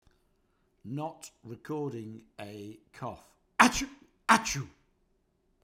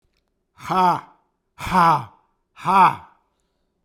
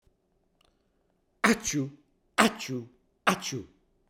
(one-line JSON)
{"cough_length": "5.6 s", "cough_amplitude": 26805, "cough_signal_mean_std_ratio": 0.31, "exhalation_length": "3.8 s", "exhalation_amplitude": 25950, "exhalation_signal_mean_std_ratio": 0.41, "three_cough_length": "4.1 s", "three_cough_amplitude": 25467, "three_cough_signal_mean_std_ratio": 0.34, "survey_phase": "beta (2021-08-13 to 2022-03-07)", "age": "45-64", "gender": "Male", "wearing_mask": "No", "symptom_none": true, "smoker_status": "Never smoked", "respiratory_condition_asthma": false, "respiratory_condition_other": false, "recruitment_source": "REACT", "submission_delay": "1 day", "covid_test_result": "Negative", "covid_test_method": "RT-qPCR", "influenza_a_test_result": "Negative", "influenza_b_test_result": "Negative"}